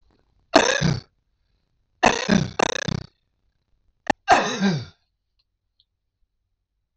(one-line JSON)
{"three_cough_length": "7.0 s", "three_cough_amplitude": 25928, "three_cough_signal_mean_std_ratio": 0.33, "survey_phase": "beta (2021-08-13 to 2022-03-07)", "age": "65+", "gender": "Male", "wearing_mask": "No", "symptom_cough_any": true, "smoker_status": "Ex-smoker", "respiratory_condition_asthma": true, "respiratory_condition_other": false, "recruitment_source": "REACT", "submission_delay": "4 days", "covid_test_result": "Negative", "covid_test_method": "RT-qPCR", "influenza_a_test_result": "Negative", "influenza_b_test_result": "Negative"}